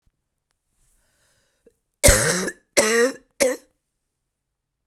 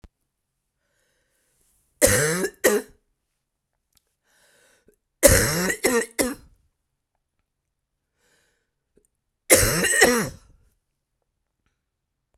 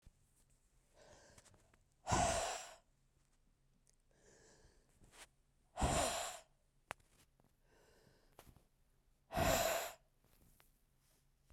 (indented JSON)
{
  "cough_length": "4.9 s",
  "cough_amplitude": 32767,
  "cough_signal_mean_std_ratio": 0.34,
  "three_cough_length": "12.4 s",
  "three_cough_amplitude": 32768,
  "three_cough_signal_mean_std_ratio": 0.32,
  "exhalation_length": "11.5 s",
  "exhalation_amplitude": 2586,
  "exhalation_signal_mean_std_ratio": 0.34,
  "survey_phase": "beta (2021-08-13 to 2022-03-07)",
  "age": "45-64",
  "gender": "Female",
  "wearing_mask": "No",
  "symptom_cough_any": true,
  "symptom_runny_or_blocked_nose": true,
  "symptom_shortness_of_breath": true,
  "symptom_fatigue": true,
  "symptom_fever_high_temperature": true,
  "symptom_headache": true,
  "symptom_change_to_sense_of_smell_or_taste": true,
  "symptom_onset": "3 days",
  "smoker_status": "Current smoker (11 or more cigarettes per day)",
  "respiratory_condition_asthma": false,
  "respiratory_condition_other": false,
  "recruitment_source": "Test and Trace",
  "submission_delay": "1 day",
  "covid_test_result": "Positive",
  "covid_test_method": "RT-qPCR",
  "covid_ct_value": 18.4,
  "covid_ct_gene": "ORF1ab gene",
  "covid_ct_mean": 19.4,
  "covid_viral_load": "450000 copies/ml",
  "covid_viral_load_category": "Low viral load (10K-1M copies/ml)"
}